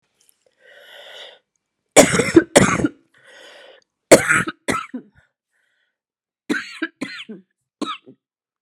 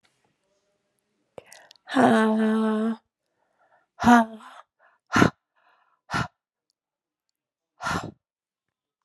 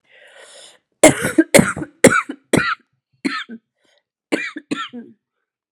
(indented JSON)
{
  "three_cough_length": "8.6 s",
  "three_cough_amplitude": 32768,
  "three_cough_signal_mean_std_ratio": 0.29,
  "exhalation_length": "9.0 s",
  "exhalation_amplitude": 27423,
  "exhalation_signal_mean_std_ratio": 0.34,
  "cough_length": "5.7 s",
  "cough_amplitude": 32768,
  "cough_signal_mean_std_ratio": 0.32,
  "survey_phase": "alpha (2021-03-01 to 2021-08-12)",
  "age": "18-44",
  "gender": "Female",
  "wearing_mask": "No",
  "symptom_cough_any": true,
  "symptom_abdominal_pain": true,
  "symptom_diarrhoea": true,
  "symptom_fatigue": true,
  "symptom_headache": true,
  "symptom_onset": "2 days",
  "smoker_status": "Never smoked",
  "respiratory_condition_asthma": false,
  "respiratory_condition_other": false,
  "recruitment_source": "Test and Trace",
  "submission_delay": "2 days",
  "covid_test_result": "Positive",
  "covid_test_method": "RT-qPCR"
}